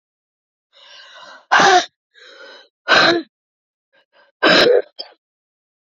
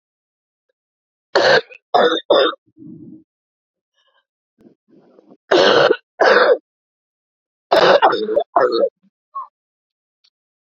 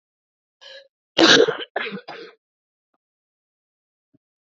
{
  "exhalation_length": "6.0 s",
  "exhalation_amplitude": 29652,
  "exhalation_signal_mean_std_ratio": 0.36,
  "three_cough_length": "10.7 s",
  "three_cough_amplitude": 32768,
  "three_cough_signal_mean_std_ratio": 0.4,
  "cough_length": "4.5 s",
  "cough_amplitude": 30028,
  "cough_signal_mean_std_ratio": 0.25,
  "survey_phase": "beta (2021-08-13 to 2022-03-07)",
  "age": "45-64",
  "gender": "Female",
  "wearing_mask": "No",
  "symptom_cough_any": true,
  "symptom_runny_or_blocked_nose": true,
  "symptom_shortness_of_breath": true,
  "symptom_sore_throat": true,
  "symptom_fatigue": true,
  "symptom_change_to_sense_of_smell_or_taste": true,
  "symptom_loss_of_taste": true,
  "symptom_onset": "4 days",
  "smoker_status": "Ex-smoker",
  "respiratory_condition_asthma": false,
  "respiratory_condition_other": false,
  "recruitment_source": "Test and Trace",
  "submission_delay": "2 days",
  "covid_test_result": "Positive",
  "covid_test_method": "RT-qPCR",
  "covid_ct_value": 30.4,
  "covid_ct_gene": "ORF1ab gene"
}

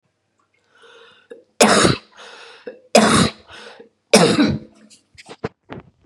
{
  "three_cough_length": "6.1 s",
  "three_cough_amplitude": 32768,
  "three_cough_signal_mean_std_ratio": 0.37,
  "survey_phase": "beta (2021-08-13 to 2022-03-07)",
  "age": "45-64",
  "gender": "Female",
  "wearing_mask": "No",
  "symptom_cough_any": true,
  "symptom_runny_or_blocked_nose": true,
  "symptom_shortness_of_breath": true,
  "symptom_fatigue": true,
  "symptom_headache": true,
  "symptom_change_to_sense_of_smell_or_taste": true,
  "symptom_loss_of_taste": true,
  "smoker_status": "Never smoked",
  "respiratory_condition_asthma": false,
  "respiratory_condition_other": false,
  "recruitment_source": "Test and Trace",
  "submission_delay": "2 days",
  "covid_test_result": "Positive",
  "covid_test_method": "LFT"
}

